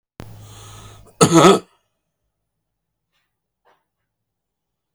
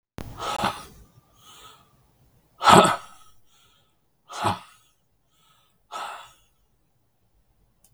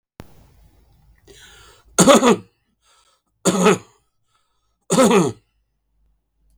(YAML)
cough_length: 4.9 s
cough_amplitude: 32768
cough_signal_mean_std_ratio: 0.24
exhalation_length: 7.9 s
exhalation_amplitude: 32768
exhalation_signal_mean_std_ratio: 0.24
three_cough_length: 6.6 s
three_cough_amplitude: 32768
three_cough_signal_mean_std_ratio: 0.33
survey_phase: beta (2021-08-13 to 2022-03-07)
age: 65+
gender: Male
wearing_mask: 'No'
symptom_fatigue: true
smoker_status: Never smoked
respiratory_condition_asthma: false
respiratory_condition_other: false
recruitment_source: REACT
submission_delay: 1 day
covid_test_result: Negative
covid_test_method: RT-qPCR
influenza_a_test_result: Negative
influenza_b_test_result: Negative